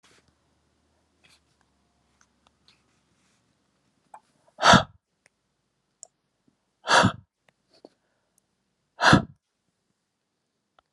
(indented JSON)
{
  "exhalation_length": "10.9 s",
  "exhalation_amplitude": 26212,
  "exhalation_signal_mean_std_ratio": 0.19,
  "survey_phase": "beta (2021-08-13 to 2022-03-07)",
  "age": "45-64",
  "gender": "Male",
  "wearing_mask": "No",
  "symptom_none": true,
  "smoker_status": "Never smoked",
  "respiratory_condition_asthma": false,
  "respiratory_condition_other": false,
  "recruitment_source": "REACT",
  "submission_delay": "1 day",
  "covid_test_result": "Negative",
  "covid_test_method": "RT-qPCR"
}